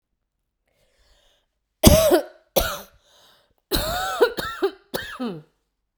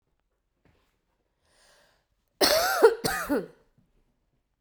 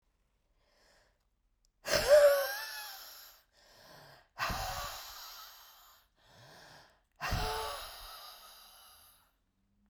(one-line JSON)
{"three_cough_length": "6.0 s", "three_cough_amplitude": 32768, "three_cough_signal_mean_std_ratio": 0.36, "cough_length": "4.6 s", "cough_amplitude": 19257, "cough_signal_mean_std_ratio": 0.32, "exhalation_length": "9.9 s", "exhalation_amplitude": 7184, "exhalation_signal_mean_std_ratio": 0.34, "survey_phase": "beta (2021-08-13 to 2022-03-07)", "age": "45-64", "gender": "Female", "wearing_mask": "No", "symptom_cough_any": true, "symptom_fatigue": true, "symptom_loss_of_taste": true, "symptom_onset": "4 days", "smoker_status": "Ex-smoker", "respiratory_condition_asthma": false, "respiratory_condition_other": false, "recruitment_source": "Test and Trace", "submission_delay": "1 day", "covid_test_result": "Positive", "covid_test_method": "RT-qPCR", "covid_ct_value": 18.5, "covid_ct_gene": "ORF1ab gene", "covid_ct_mean": 19.3, "covid_viral_load": "480000 copies/ml", "covid_viral_load_category": "Low viral load (10K-1M copies/ml)"}